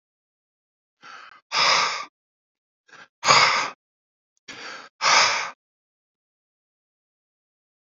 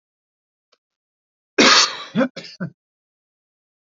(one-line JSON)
{"exhalation_length": "7.9 s", "exhalation_amplitude": 25626, "exhalation_signal_mean_std_ratio": 0.34, "cough_length": "3.9 s", "cough_amplitude": 31435, "cough_signal_mean_std_ratio": 0.29, "survey_phase": "alpha (2021-03-01 to 2021-08-12)", "age": "45-64", "gender": "Male", "wearing_mask": "No", "symptom_none": true, "smoker_status": "Never smoked", "respiratory_condition_asthma": false, "respiratory_condition_other": false, "recruitment_source": "REACT", "submission_delay": "3 days", "covid_test_result": "Negative", "covid_test_method": "RT-qPCR"}